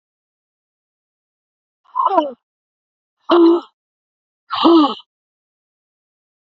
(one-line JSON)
{"exhalation_length": "6.5 s", "exhalation_amplitude": 28226, "exhalation_signal_mean_std_ratio": 0.32, "survey_phase": "beta (2021-08-13 to 2022-03-07)", "age": "65+", "gender": "Female", "wearing_mask": "Yes", "symptom_cough_any": true, "symptom_runny_or_blocked_nose": true, "symptom_fatigue": true, "symptom_headache": true, "symptom_onset": "4 days", "smoker_status": "Ex-smoker", "respiratory_condition_asthma": false, "respiratory_condition_other": true, "recruitment_source": "Test and Trace", "submission_delay": "2 days", "covid_test_result": "Positive", "covid_test_method": "RT-qPCR", "covid_ct_value": 16.4, "covid_ct_gene": "ORF1ab gene", "covid_ct_mean": 16.7, "covid_viral_load": "3400000 copies/ml", "covid_viral_load_category": "High viral load (>1M copies/ml)"}